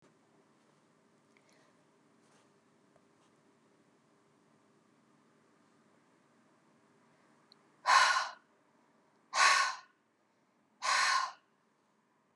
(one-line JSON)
{"exhalation_length": "12.4 s", "exhalation_amplitude": 7958, "exhalation_signal_mean_std_ratio": 0.27, "survey_phase": "beta (2021-08-13 to 2022-03-07)", "age": "45-64", "gender": "Female", "wearing_mask": "No", "symptom_shortness_of_breath": true, "symptom_fatigue": true, "symptom_onset": "12 days", "smoker_status": "Never smoked", "respiratory_condition_asthma": false, "respiratory_condition_other": false, "recruitment_source": "REACT", "submission_delay": "2 days", "covid_test_result": "Negative", "covid_test_method": "RT-qPCR", "influenza_a_test_result": "Negative", "influenza_b_test_result": "Negative"}